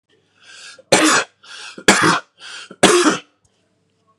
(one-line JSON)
{"three_cough_length": "4.2 s", "three_cough_amplitude": 32768, "three_cough_signal_mean_std_ratio": 0.42, "survey_phase": "beta (2021-08-13 to 2022-03-07)", "age": "18-44", "gender": "Male", "wearing_mask": "No", "symptom_none": true, "smoker_status": "Never smoked", "respiratory_condition_asthma": false, "respiratory_condition_other": false, "recruitment_source": "REACT", "submission_delay": "1 day", "covid_test_result": "Negative", "covid_test_method": "RT-qPCR", "influenza_a_test_result": "Negative", "influenza_b_test_result": "Negative"}